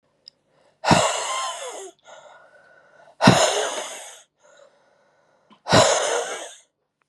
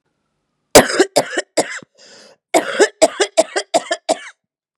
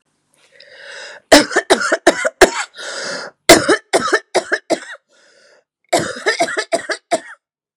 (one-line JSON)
{"exhalation_length": "7.1 s", "exhalation_amplitude": 32767, "exhalation_signal_mean_std_ratio": 0.41, "cough_length": "4.8 s", "cough_amplitude": 32768, "cough_signal_mean_std_ratio": 0.37, "three_cough_length": "7.8 s", "three_cough_amplitude": 32768, "three_cough_signal_mean_std_ratio": 0.41, "survey_phase": "beta (2021-08-13 to 2022-03-07)", "age": "18-44", "gender": "Female", "wearing_mask": "No", "symptom_runny_or_blocked_nose": true, "symptom_abdominal_pain": true, "symptom_fatigue": true, "symptom_headache": true, "symptom_change_to_sense_of_smell_or_taste": true, "symptom_onset": "6 days", "smoker_status": "Current smoker (1 to 10 cigarettes per day)", "respiratory_condition_asthma": false, "respiratory_condition_other": false, "recruitment_source": "Test and Trace", "submission_delay": "1 day", "covid_test_result": "Positive", "covid_test_method": "RT-qPCR", "covid_ct_value": 25.9, "covid_ct_gene": "ORF1ab gene", "covid_ct_mean": 26.5, "covid_viral_load": "2100 copies/ml", "covid_viral_load_category": "Minimal viral load (< 10K copies/ml)"}